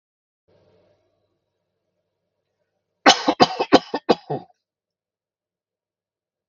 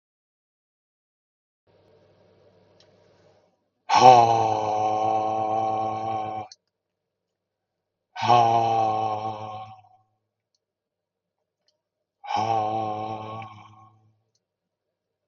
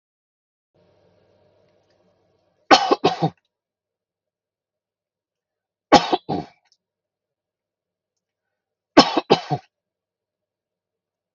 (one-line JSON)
{"cough_length": "6.5 s", "cough_amplitude": 32768, "cough_signal_mean_std_ratio": 0.2, "exhalation_length": "15.3 s", "exhalation_amplitude": 32768, "exhalation_signal_mean_std_ratio": 0.41, "three_cough_length": "11.3 s", "three_cough_amplitude": 32768, "three_cough_signal_mean_std_ratio": 0.2, "survey_phase": "beta (2021-08-13 to 2022-03-07)", "age": "45-64", "gender": "Male", "wearing_mask": "No", "symptom_none": true, "smoker_status": "Never smoked", "respiratory_condition_asthma": false, "respiratory_condition_other": false, "recruitment_source": "REACT", "submission_delay": "1 day", "covid_test_result": "Negative", "covid_test_method": "RT-qPCR", "influenza_a_test_result": "Negative", "influenza_b_test_result": "Negative"}